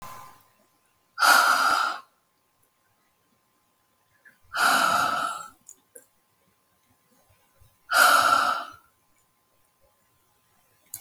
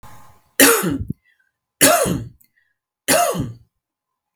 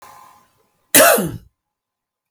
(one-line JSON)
{"exhalation_length": "11.0 s", "exhalation_amplitude": 18539, "exhalation_signal_mean_std_ratio": 0.38, "three_cough_length": "4.4 s", "three_cough_amplitude": 32768, "three_cough_signal_mean_std_ratio": 0.42, "cough_length": "2.3 s", "cough_amplitude": 32768, "cough_signal_mean_std_ratio": 0.32, "survey_phase": "beta (2021-08-13 to 2022-03-07)", "age": "45-64", "gender": "Female", "wearing_mask": "No", "symptom_none": true, "smoker_status": "Never smoked", "respiratory_condition_asthma": false, "respiratory_condition_other": false, "recruitment_source": "REACT", "submission_delay": "2 days", "covid_test_result": "Negative", "covid_test_method": "RT-qPCR", "influenza_a_test_result": "Negative", "influenza_b_test_result": "Negative"}